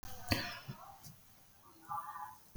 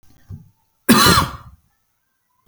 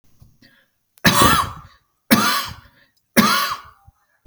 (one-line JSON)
{"exhalation_length": "2.6 s", "exhalation_amplitude": 5037, "exhalation_signal_mean_std_ratio": 0.56, "cough_length": "2.5 s", "cough_amplitude": 32768, "cough_signal_mean_std_ratio": 0.34, "three_cough_length": "4.3 s", "three_cough_amplitude": 32768, "three_cough_signal_mean_std_ratio": 0.43, "survey_phase": "beta (2021-08-13 to 2022-03-07)", "age": "45-64", "gender": "Male", "wearing_mask": "No", "symptom_none": true, "smoker_status": "Ex-smoker", "respiratory_condition_asthma": false, "respiratory_condition_other": false, "recruitment_source": "REACT", "submission_delay": "2 days", "covid_test_result": "Negative", "covid_test_method": "RT-qPCR"}